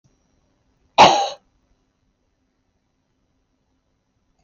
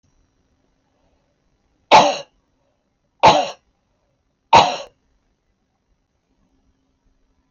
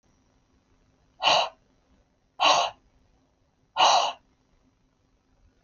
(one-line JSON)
{"cough_length": "4.4 s", "cough_amplitude": 26938, "cough_signal_mean_std_ratio": 0.2, "three_cough_length": "7.5 s", "three_cough_amplitude": 26879, "three_cough_signal_mean_std_ratio": 0.24, "exhalation_length": "5.6 s", "exhalation_amplitude": 17508, "exhalation_signal_mean_std_ratio": 0.32, "survey_phase": "beta (2021-08-13 to 2022-03-07)", "age": "65+", "gender": "Female", "wearing_mask": "No", "symptom_none": true, "smoker_status": "Never smoked", "respiratory_condition_asthma": false, "respiratory_condition_other": false, "recruitment_source": "Test and Trace", "submission_delay": "2 days", "covid_test_result": "Negative", "covid_test_method": "LFT"}